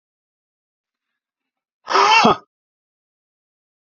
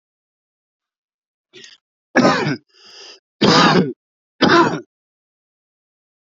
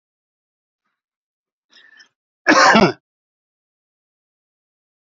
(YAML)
exhalation_length: 3.8 s
exhalation_amplitude: 28384
exhalation_signal_mean_std_ratio: 0.27
three_cough_length: 6.4 s
three_cough_amplitude: 32532
three_cough_signal_mean_std_ratio: 0.35
cough_length: 5.1 s
cough_amplitude: 29321
cough_signal_mean_std_ratio: 0.23
survey_phase: beta (2021-08-13 to 2022-03-07)
age: 45-64
gender: Male
wearing_mask: 'No'
symptom_cough_any: true
symptom_runny_or_blocked_nose: true
symptom_fatigue: true
symptom_onset: 4 days
smoker_status: Never smoked
respiratory_condition_asthma: false
respiratory_condition_other: false
recruitment_source: Test and Trace
submission_delay: 2 days
covid_test_result: Positive
covid_test_method: RT-qPCR
covid_ct_value: 18.3
covid_ct_gene: N gene